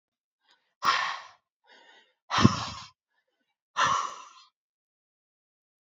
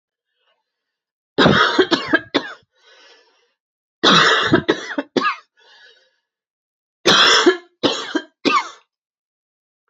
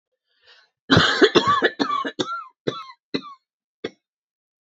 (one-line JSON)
{"exhalation_length": "5.8 s", "exhalation_amplitude": 24358, "exhalation_signal_mean_std_ratio": 0.31, "three_cough_length": "9.9 s", "three_cough_amplitude": 31725, "three_cough_signal_mean_std_ratio": 0.41, "cough_length": "4.7 s", "cough_amplitude": 27419, "cough_signal_mean_std_ratio": 0.4, "survey_phase": "beta (2021-08-13 to 2022-03-07)", "age": "45-64", "gender": "Female", "wearing_mask": "No", "symptom_runny_or_blocked_nose": true, "symptom_abdominal_pain": true, "symptom_fatigue": true, "symptom_headache": true, "symptom_other": true, "symptom_onset": "7 days", "smoker_status": "Never smoked", "respiratory_condition_asthma": false, "respiratory_condition_other": false, "recruitment_source": "Test and Trace", "submission_delay": "3 days", "covid_test_result": "Positive", "covid_test_method": "RT-qPCR"}